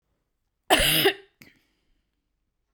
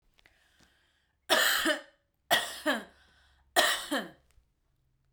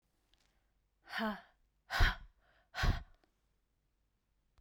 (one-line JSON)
{"cough_length": "2.7 s", "cough_amplitude": 21093, "cough_signal_mean_std_ratio": 0.32, "three_cough_length": "5.1 s", "three_cough_amplitude": 12218, "three_cough_signal_mean_std_ratio": 0.4, "exhalation_length": "4.6 s", "exhalation_amplitude": 4688, "exhalation_signal_mean_std_ratio": 0.29, "survey_phase": "beta (2021-08-13 to 2022-03-07)", "age": "18-44", "gender": "Female", "wearing_mask": "No", "symptom_cough_any": true, "symptom_sore_throat": true, "symptom_diarrhoea": true, "symptom_fatigue": true, "symptom_fever_high_temperature": true, "symptom_headache": true, "symptom_onset": "2 days", "smoker_status": "Never smoked", "respiratory_condition_asthma": false, "respiratory_condition_other": false, "recruitment_source": "Test and Trace", "submission_delay": "1 day", "covid_test_result": "Positive", "covid_test_method": "RT-qPCR", "covid_ct_value": 30.3, "covid_ct_gene": "ORF1ab gene", "covid_ct_mean": 30.4, "covid_viral_load": "100 copies/ml", "covid_viral_load_category": "Minimal viral load (< 10K copies/ml)"}